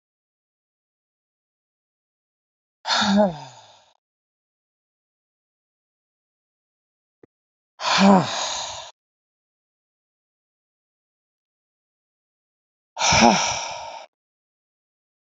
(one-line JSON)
{"exhalation_length": "15.3 s", "exhalation_amplitude": 27240, "exhalation_signal_mean_std_ratio": 0.27, "survey_phase": "alpha (2021-03-01 to 2021-08-12)", "age": "45-64", "gender": "Female", "wearing_mask": "No", "symptom_none": true, "smoker_status": "Ex-smoker", "respiratory_condition_asthma": false, "respiratory_condition_other": false, "recruitment_source": "REACT", "submission_delay": "5 days", "covid_test_result": "Negative", "covid_test_method": "RT-qPCR"}